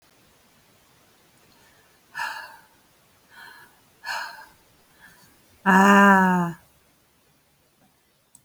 {"exhalation_length": "8.4 s", "exhalation_amplitude": 20268, "exhalation_signal_mean_std_ratio": 0.3, "survey_phase": "beta (2021-08-13 to 2022-03-07)", "age": "45-64", "gender": "Female", "wearing_mask": "No", "symptom_cough_any": true, "symptom_new_continuous_cough": true, "symptom_runny_or_blocked_nose": true, "symptom_shortness_of_breath": true, "symptom_fatigue": true, "symptom_fever_high_temperature": true, "symptom_change_to_sense_of_smell_or_taste": true, "symptom_loss_of_taste": true, "symptom_onset": "8 days", "smoker_status": "Ex-smoker", "respiratory_condition_asthma": false, "respiratory_condition_other": false, "recruitment_source": "Test and Trace", "submission_delay": "2 days", "covid_test_result": "Positive", "covid_test_method": "RT-qPCR", "covid_ct_value": 24.3, "covid_ct_gene": "ORF1ab gene"}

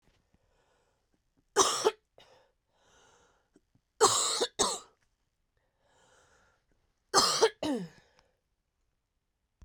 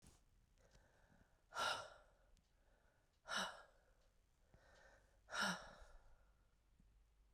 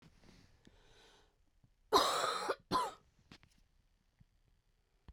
{"three_cough_length": "9.6 s", "three_cough_amplitude": 14095, "three_cough_signal_mean_std_ratio": 0.3, "exhalation_length": "7.3 s", "exhalation_amplitude": 940, "exhalation_signal_mean_std_ratio": 0.36, "cough_length": "5.1 s", "cough_amplitude": 6041, "cough_signal_mean_std_ratio": 0.33, "survey_phase": "beta (2021-08-13 to 2022-03-07)", "age": "18-44", "gender": "Female", "wearing_mask": "No", "symptom_cough_any": true, "symptom_runny_or_blocked_nose": true, "symptom_shortness_of_breath": true, "symptom_sore_throat": true, "symptom_fatigue": true, "symptom_change_to_sense_of_smell_or_taste": true, "symptom_onset": "4 days", "smoker_status": "Ex-smoker", "respiratory_condition_asthma": false, "respiratory_condition_other": false, "recruitment_source": "Test and Trace", "submission_delay": "2 days", "covid_test_result": "Positive", "covid_test_method": "RT-qPCR", "covid_ct_value": 14.8, "covid_ct_gene": "ORF1ab gene", "covid_ct_mean": 15.4, "covid_viral_load": "8800000 copies/ml", "covid_viral_load_category": "High viral load (>1M copies/ml)"}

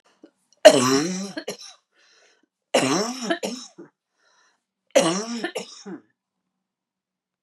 {"three_cough_length": "7.4 s", "three_cough_amplitude": 32768, "three_cough_signal_mean_std_ratio": 0.33, "survey_phase": "beta (2021-08-13 to 2022-03-07)", "age": "65+", "gender": "Female", "wearing_mask": "No", "symptom_none": true, "smoker_status": "Never smoked", "respiratory_condition_asthma": true, "respiratory_condition_other": false, "recruitment_source": "REACT", "submission_delay": "3 days", "covid_test_result": "Negative", "covid_test_method": "RT-qPCR"}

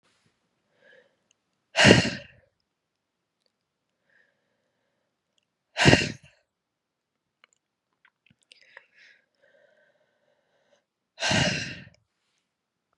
{"exhalation_length": "13.0 s", "exhalation_amplitude": 31314, "exhalation_signal_mean_std_ratio": 0.21, "survey_phase": "beta (2021-08-13 to 2022-03-07)", "age": "18-44", "gender": "Female", "wearing_mask": "No", "symptom_new_continuous_cough": true, "symptom_runny_or_blocked_nose": true, "symptom_shortness_of_breath": true, "symptom_sore_throat": true, "symptom_abdominal_pain": true, "symptom_fatigue": true, "symptom_fever_high_temperature": true, "symptom_headache": true, "symptom_change_to_sense_of_smell_or_taste": true, "smoker_status": "Ex-smoker", "respiratory_condition_asthma": true, "respiratory_condition_other": false, "recruitment_source": "Test and Trace", "submission_delay": "1 day", "covid_test_result": "Positive", "covid_test_method": "LFT"}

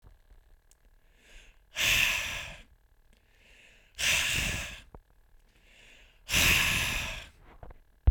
{"exhalation_length": "8.1 s", "exhalation_amplitude": 11434, "exhalation_signal_mean_std_ratio": 0.44, "survey_phase": "beta (2021-08-13 to 2022-03-07)", "age": "18-44", "gender": "Male", "wearing_mask": "No", "symptom_none": true, "smoker_status": "Never smoked", "respiratory_condition_asthma": false, "respiratory_condition_other": false, "recruitment_source": "REACT", "submission_delay": "1 day", "covid_test_result": "Negative", "covid_test_method": "RT-qPCR", "influenza_a_test_result": "Negative", "influenza_b_test_result": "Negative"}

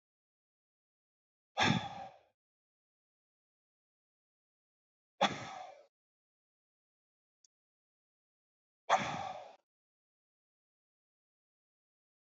{"exhalation_length": "12.2 s", "exhalation_amplitude": 4922, "exhalation_signal_mean_std_ratio": 0.21, "survey_phase": "beta (2021-08-13 to 2022-03-07)", "age": "45-64", "gender": "Male", "wearing_mask": "No", "symptom_none": true, "smoker_status": "Ex-smoker", "respiratory_condition_asthma": false, "respiratory_condition_other": false, "recruitment_source": "REACT", "submission_delay": "2 days", "covid_test_result": "Negative", "covid_test_method": "RT-qPCR", "influenza_a_test_result": "Unknown/Void", "influenza_b_test_result": "Unknown/Void"}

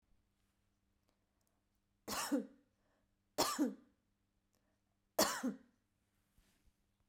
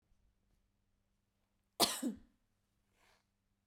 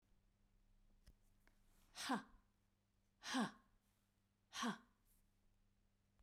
{"three_cough_length": "7.1 s", "three_cough_amplitude": 3759, "three_cough_signal_mean_std_ratio": 0.29, "cough_length": "3.7 s", "cough_amplitude": 6173, "cough_signal_mean_std_ratio": 0.21, "exhalation_length": "6.2 s", "exhalation_amplitude": 914, "exhalation_signal_mean_std_ratio": 0.31, "survey_phase": "beta (2021-08-13 to 2022-03-07)", "age": "45-64", "gender": "Female", "wearing_mask": "No", "symptom_fatigue": true, "smoker_status": "Ex-smoker", "respiratory_condition_asthma": false, "respiratory_condition_other": false, "recruitment_source": "REACT", "submission_delay": "2 days", "covid_test_result": "Negative", "covid_test_method": "RT-qPCR"}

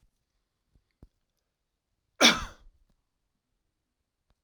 {"three_cough_length": "4.4 s", "three_cough_amplitude": 17792, "three_cough_signal_mean_std_ratio": 0.16, "survey_phase": "alpha (2021-03-01 to 2021-08-12)", "age": "65+", "gender": "Male", "wearing_mask": "No", "symptom_none": true, "smoker_status": "Never smoked", "respiratory_condition_asthma": false, "respiratory_condition_other": false, "recruitment_source": "REACT", "submission_delay": "3 days", "covid_test_result": "Negative", "covid_test_method": "RT-qPCR"}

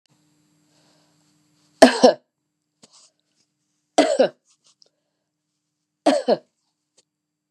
{"three_cough_length": "7.5 s", "three_cough_amplitude": 32768, "three_cough_signal_mean_std_ratio": 0.23, "survey_phase": "beta (2021-08-13 to 2022-03-07)", "age": "45-64", "gender": "Female", "wearing_mask": "No", "symptom_none": true, "symptom_onset": "3 days", "smoker_status": "Never smoked", "respiratory_condition_asthma": false, "respiratory_condition_other": false, "recruitment_source": "Test and Trace", "submission_delay": "2 days", "covid_test_result": "Positive", "covid_test_method": "RT-qPCR", "covid_ct_value": 20.3, "covid_ct_gene": "ORF1ab gene", "covid_ct_mean": 20.6, "covid_viral_load": "170000 copies/ml", "covid_viral_load_category": "Low viral load (10K-1M copies/ml)"}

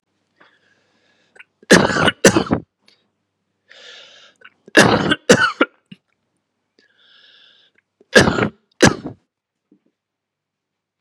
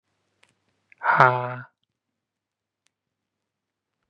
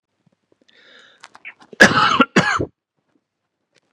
{"three_cough_length": "11.0 s", "three_cough_amplitude": 32768, "three_cough_signal_mean_std_ratio": 0.29, "exhalation_length": "4.1 s", "exhalation_amplitude": 32767, "exhalation_signal_mean_std_ratio": 0.23, "cough_length": "3.9 s", "cough_amplitude": 32768, "cough_signal_mean_std_ratio": 0.31, "survey_phase": "beta (2021-08-13 to 2022-03-07)", "age": "18-44", "gender": "Male", "wearing_mask": "No", "symptom_cough_any": true, "symptom_sore_throat": true, "symptom_diarrhoea": true, "smoker_status": "Never smoked", "respiratory_condition_asthma": false, "respiratory_condition_other": false, "recruitment_source": "Test and Trace", "submission_delay": "1 day", "covid_test_result": "Positive", "covid_test_method": "RT-qPCR", "covid_ct_value": 21.7, "covid_ct_gene": "ORF1ab gene"}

